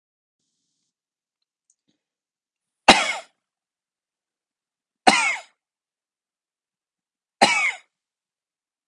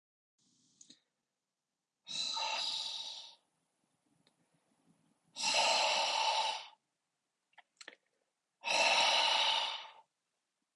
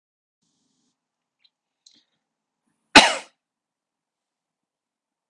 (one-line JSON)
{"three_cough_length": "8.9 s", "three_cough_amplitude": 32768, "three_cough_signal_mean_std_ratio": 0.21, "exhalation_length": "10.8 s", "exhalation_amplitude": 3971, "exhalation_signal_mean_std_ratio": 0.47, "cough_length": "5.3 s", "cough_amplitude": 32768, "cough_signal_mean_std_ratio": 0.13, "survey_phase": "beta (2021-08-13 to 2022-03-07)", "age": "45-64", "gender": "Male", "wearing_mask": "No", "symptom_none": true, "smoker_status": "Never smoked", "respiratory_condition_asthma": false, "respiratory_condition_other": false, "recruitment_source": "REACT", "submission_delay": "3 days", "covid_test_result": "Negative", "covid_test_method": "RT-qPCR"}